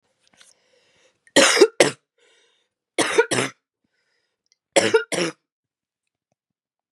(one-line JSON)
{"three_cough_length": "6.9 s", "three_cough_amplitude": 32659, "three_cough_signal_mean_std_ratio": 0.3, "survey_phase": "beta (2021-08-13 to 2022-03-07)", "age": "18-44", "gender": "Female", "wearing_mask": "No", "symptom_cough_any": true, "symptom_runny_or_blocked_nose": true, "symptom_shortness_of_breath": true, "symptom_sore_throat": true, "symptom_abdominal_pain": true, "symptom_fatigue": true, "symptom_fever_high_temperature": true, "symptom_headache": true, "symptom_change_to_sense_of_smell_or_taste": true, "symptom_loss_of_taste": true, "symptom_other": true, "symptom_onset": "5 days", "smoker_status": "Ex-smoker", "respiratory_condition_asthma": false, "respiratory_condition_other": false, "recruitment_source": "Test and Trace", "submission_delay": "2 days", "covid_test_result": "Positive", "covid_test_method": "RT-qPCR", "covid_ct_value": 17.9, "covid_ct_gene": "ORF1ab gene", "covid_ct_mean": 18.2, "covid_viral_load": "1000000 copies/ml", "covid_viral_load_category": "High viral load (>1M copies/ml)"}